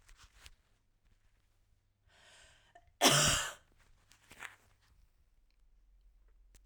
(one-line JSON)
{"cough_length": "6.7 s", "cough_amplitude": 10264, "cough_signal_mean_std_ratio": 0.24, "survey_phase": "beta (2021-08-13 to 2022-03-07)", "age": "18-44", "gender": "Female", "wearing_mask": "No", "symptom_runny_or_blocked_nose": true, "symptom_sore_throat": true, "symptom_onset": "13 days", "smoker_status": "Ex-smoker", "respiratory_condition_asthma": false, "respiratory_condition_other": false, "recruitment_source": "REACT", "submission_delay": "1 day", "covid_test_result": "Negative", "covid_test_method": "RT-qPCR", "influenza_a_test_result": "Negative", "influenza_b_test_result": "Negative"}